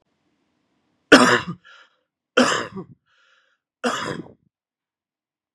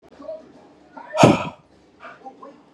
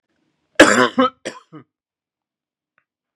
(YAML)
three_cough_length: 5.5 s
three_cough_amplitude: 32768
three_cough_signal_mean_std_ratio: 0.27
exhalation_length: 2.7 s
exhalation_amplitude: 32301
exhalation_signal_mean_std_ratio: 0.29
cough_length: 3.2 s
cough_amplitude: 32768
cough_signal_mean_std_ratio: 0.27
survey_phase: beta (2021-08-13 to 2022-03-07)
age: 18-44
gender: Male
wearing_mask: 'No'
symptom_cough_any: true
symptom_runny_or_blocked_nose: true
symptom_sore_throat: true
symptom_fever_high_temperature: true
symptom_onset: 5 days
smoker_status: Never smoked
respiratory_condition_asthma: false
respiratory_condition_other: false
recruitment_source: REACT
submission_delay: 2 days
covid_test_result: Negative
covid_test_method: RT-qPCR